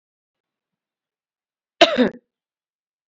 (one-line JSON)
{"cough_length": "3.1 s", "cough_amplitude": 29430, "cough_signal_mean_std_ratio": 0.2, "survey_phase": "beta (2021-08-13 to 2022-03-07)", "age": "18-44", "gender": "Female", "wearing_mask": "No", "symptom_none": true, "smoker_status": "Ex-smoker", "respiratory_condition_asthma": false, "respiratory_condition_other": false, "recruitment_source": "REACT", "submission_delay": "1 day", "covid_test_result": "Negative", "covid_test_method": "RT-qPCR", "influenza_a_test_result": "Negative", "influenza_b_test_result": "Negative"}